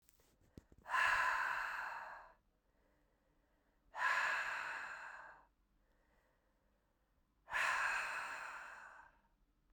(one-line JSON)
{"exhalation_length": "9.7 s", "exhalation_amplitude": 2601, "exhalation_signal_mean_std_ratio": 0.5, "survey_phase": "beta (2021-08-13 to 2022-03-07)", "age": "45-64", "gender": "Female", "wearing_mask": "No", "symptom_cough_any": true, "symptom_runny_or_blocked_nose": true, "symptom_headache": true, "symptom_change_to_sense_of_smell_or_taste": true, "symptom_loss_of_taste": true, "symptom_onset": "3 days", "smoker_status": "Ex-smoker", "respiratory_condition_asthma": false, "respiratory_condition_other": false, "recruitment_source": "Test and Trace", "submission_delay": "2 days", "covid_test_result": "Positive", "covid_test_method": "RT-qPCR", "covid_ct_value": 24.8, "covid_ct_gene": "ORF1ab gene"}